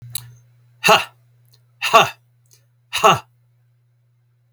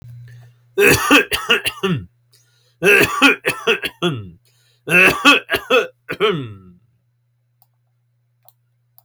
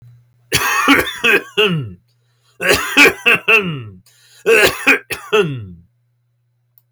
{
  "exhalation_length": "4.5 s",
  "exhalation_amplitude": 32031,
  "exhalation_signal_mean_std_ratio": 0.29,
  "three_cough_length": "9.0 s",
  "three_cough_amplitude": 32767,
  "three_cough_signal_mean_std_ratio": 0.45,
  "cough_length": "6.9 s",
  "cough_amplitude": 32767,
  "cough_signal_mean_std_ratio": 0.52,
  "survey_phase": "alpha (2021-03-01 to 2021-08-12)",
  "age": "45-64",
  "gender": "Male",
  "wearing_mask": "No",
  "symptom_none": true,
  "smoker_status": "Never smoked",
  "respiratory_condition_asthma": false,
  "respiratory_condition_other": false,
  "recruitment_source": "REACT",
  "submission_delay": "2 days",
  "covid_test_result": "Negative",
  "covid_test_method": "RT-qPCR"
}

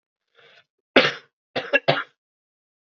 {
  "three_cough_length": "2.8 s",
  "three_cough_amplitude": 32620,
  "three_cough_signal_mean_std_ratio": 0.28,
  "survey_phase": "alpha (2021-03-01 to 2021-08-12)",
  "age": "18-44",
  "gender": "Male",
  "wearing_mask": "No",
  "symptom_cough_any": true,
  "symptom_fatigue": true,
  "symptom_headache": true,
  "symptom_onset": "3 days",
  "smoker_status": "Never smoked",
  "respiratory_condition_asthma": true,
  "respiratory_condition_other": false,
  "recruitment_source": "Test and Trace",
  "submission_delay": "1 day",
  "covid_test_result": "Positive",
  "covid_test_method": "RT-qPCR",
  "covid_ct_value": 24.5,
  "covid_ct_gene": "ORF1ab gene"
}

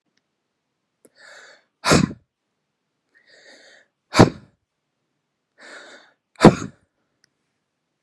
{
  "exhalation_length": "8.0 s",
  "exhalation_amplitude": 32768,
  "exhalation_signal_mean_std_ratio": 0.18,
  "survey_phase": "beta (2021-08-13 to 2022-03-07)",
  "age": "45-64",
  "gender": "Male",
  "wearing_mask": "No",
  "symptom_none": true,
  "smoker_status": "Ex-smoker",
  "respiratory_condition_asthma": true,
  "respiratory_condition_other": false,
  "recruitment_source": "REACT",
  "submission_delay": "2 days",
  "covid_test_result": "Negative",
  "covid_test_method": "RT-qPCR"
}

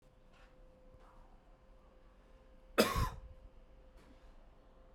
{
  "cough_length": "4.9 s",
  "cough_amplitude": 6564,
  "cough_signal_mean_std_ratio": 0.3,
  "survey_phase": "beta (2021-08-13 to 2022-03-07)",
  "age": "18-44",
  "gender": "Male",
  "wearing_mask": "Yes",
  "symptom_runny_or_blocked_nose": true,
  "symptom_onset": "2 days",
  "smoker_status": "Ex-smoker",
  "respiratory_condition_asthma": false,
  "respiratory_condition_other": false,
  "recruitment_source": "Test and Trace",
  "submission_delay": "1 day",
  "covid_test_result": "Positive",
  "covid_test_method": "RT-qPCR"
}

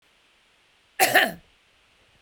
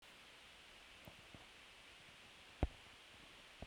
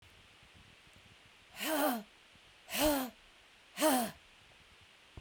{
  "cough_length": "2.2 s",
  "cough_amplitude": 19476,
  "cough_signal_mean_std_ratio": 0.29,
  "three_cough_length": "3.7 s",
  "three_cough_amplitude": 2964,
  "three_cough_signal_mean_std_ratio": 0.41,
  "exhalation_length": "5.2 s",
  "exhalation_amplitude": 5575,
  "exhalation_signal_mean_std_ratio": 0.42,
  "survey_phase": "beta (2021-08-13 to 2022-03-07)",
  "age": "45-64",
  "gender": "Female",
  "wearing_mask": "No",
  "symptom_other": true,
  "smoker_status": "Never smoked",
  "respiratory_condition_asthma": false,
  "respiratory_condition_other": false,
  "recruitment_source": "Test and Trace",
  "submission_delay": "1 day",
  "covid_test_result": "Negative",
  "covid_test_method": "ePCR"
}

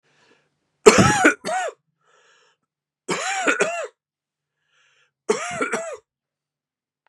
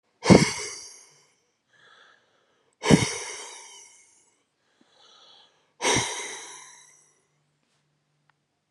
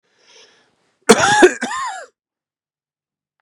{
  "three_cough_length": "7.1 s",
  "three_cough_amplitude": 32768,
  "three_cough_signal_mean_std_ratio": 0.34,
  "exhalation_length": "8.7 s",
  "exhalation_amplitude": 30236,
  "exhalation_signal_mean_std_ratio": 0.25,
  "cough_length": "3.4 s",
  "cough_amplitude": 32768,
  "cough_signal_mean_std_ratio": 0.32,
  "survey_phase": "beta (2021-08-13 to 2022-03-07)",
  "age": "45-64",
  "gender": "Male",
  "wearing_mask": "No",
  "symptom_cough_any": true,
  "symptom_runny_or_blocked_nose": true,
  "symptom_fatigue": true,
  "symptom_headache": true,
  "symptom_onset": "4 days",
  "smoker_status": "Never smoked",
  "respiratory_condition_asthma": false,
  "respiratory_condition_other": false,
  "recruitment_source": "REACT",
  "submission_delay": "0 days",
  "covid_test_result": "Positive",
  "covid_test_method": "RT-qPCR",
  "covid_ct_value": 18.0,
  "covid_ct_gene": "E gene",
  "influenza_a_test_result": "Negative",
  "influenza_b_test_result": "Negative"
}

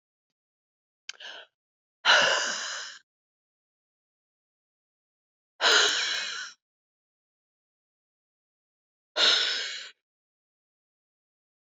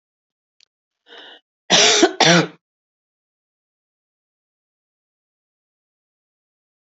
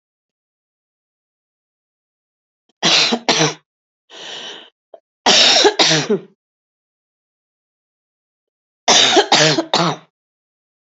{
  "exhalation_length": "11.6 s",
  "exhalation_amplitude": 13644,
  "exhalation_signal_mean_std_ratio": 0.32,
  "cough_length": "6.8 s",
  "cough_amplitude": 32768,
  "cough_signal_mean_std_ratio": 0.25,
  "three_cough_length": "10.9 s",
  "three_cough_amplitude": 32768,
  "three_cough_signal_mean_std_ratio": 0.38,
  "survey_phase": "beta (2021-08-13 to 2022-03-07)",
  "age": "65+",
  "gender": "Female",
  "wearing_mask": "No",
  "symptom_cough_any": true,
  "symptom_runny_or_blocked_nose": true,
  "symptom_shortness_of_breath": true,
  "symptom_headache": true,
  "symptom_change_to_sense_of_smell_or_taste": true,
  "symptom_onset": "6 days",
  "smoker_status": "Never smoked",
  "respiratory_condition_asthma": false,
  "respiratory_condition_other": false,
  "recruitment_source": "Test and Trace",
  "submission_delay": "2 days",
  "covid_test_result": "Positive",
  "covid_test_method": "ePCR"
}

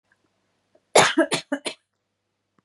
{
  "three_cough_length": "2.6 s",
  "three_cough_amplitude": 30615,
  "three_cough_signal_mean_std_ratio": 0.29,
  "survey_phase": "beta (2021-08-13 to 2022-03-07)",
  "age": "18-44",
  "gender": "Female",
  "wearing_mask": "No",
  "symptom_none": true,
  "smoker_status": "Ex-smoker",
  "respiratory_condition_asthma": false,
  "respiratory_condition_other": false,
  "recruitment_source": "REACT",
  "submission_delay": "6 days",
  "covid_test_result": "Negative",
  "covid_test_method": "RT-qPCR",
  "influenza_a_test_result": "Negative",
  "influenza_b_test_result": "Negative"
}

